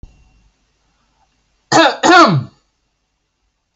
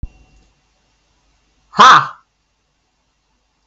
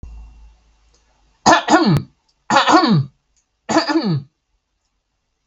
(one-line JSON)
{"cough_length": "3.8 s", "cough_amplitude": 32768, "cough_signal_mean_std_ratio": 0.34, "exhalation_length": "3.7 s", "exhalation_amplitude": 32768, "exhalation_signal_mean_std_ratio": 0.24, "three_cough_length": "5.5 s", "three_cough_amplitude": 32768, "three_cough_signal_mean_std_ratio": 0.44, "survey_phase": "beta (2021-08-13 to 2022-03-07)", "age": "18-44", "gender": "Male", "wearing_mask": "No", "symptom_none": true, "smoker_status": "Never smoked", "respiratory_condition_asthma": false, "respiratory_condition_other": false, "recruitment_source": "REACT", "submission_delay": "1 day", "covid_test_result": "Negative", "covid_test_method": "RT-qPCR", "influenza_a_test_result": "Negative", "influenza_b_test_result": "Negative"}